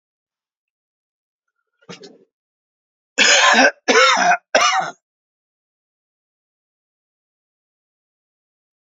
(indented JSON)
{
  "cough_length": "8.9 s",
  "cough_amplitude": 31255,
  "cough_signal_mean_std_ratio": 0.32,
  "survey_phase": "beta (2021-08-13 to 2022-03-07)",
  "age": "65+",
  "gender": "Male",
  "wearing_mask": "No",
  "symptom_cough_any": true,
  "symptom_shortness_of_breath": true,
  "symptom_sore_throat": true,
  "symptom_onset": "13 days",
  "smoker_status": "Ex-smoker",
  "respiratory_condition_asthma": true,
  "respiratory_condition_other": false,
  "recruitment_source": "REACT",
  "submission_delay": "1 day",
  "covid_test_result": "Negative",
  "covid_test_method": "RT-qPCR"
}